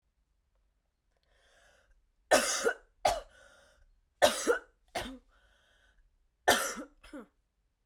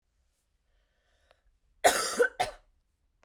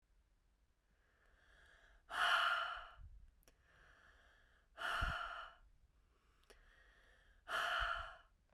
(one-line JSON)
{"three_cough_length": "7.9 s", "three_cough_amplitude": 11137, "three_cough_signal_mean_std_ratio": 0.3, "cough_length": "3.2 s", "cough_amplitude": 12901, "cough_signal_mean_std_ratio": 0.28, "exhalation_length": "8.5 s", "exhalation_amplitude": 2068, "exhalation_signal_mean_std_ratio": 0.42, "survey_phase": "beta (2021-08-13 to 2022-03-07)", "age": "18-44", "gender": "Female", "wearing_mask": "No", "symptom_cough_any": true, "symptom_sore_throat": true, "symptom_onset": "2 days", "smoker_status": "Never smoked", "respiratory_condition_asthma": false, "respiratory_condition_other": false, "recruitment_source": "Test and Trace", "submission_delay": "2 days", "covid_test_result": "Positive", "covid_test_method": "RT-qPCR", "covid_ct_value": 19.8, "covid_ct_gene": "N gene", "covid_ct_mean": 20.4, "covid_viral_load": "200000 copies/ml", "covid_viral_load_category": "Low viral load (10K-1M copies/ml)"}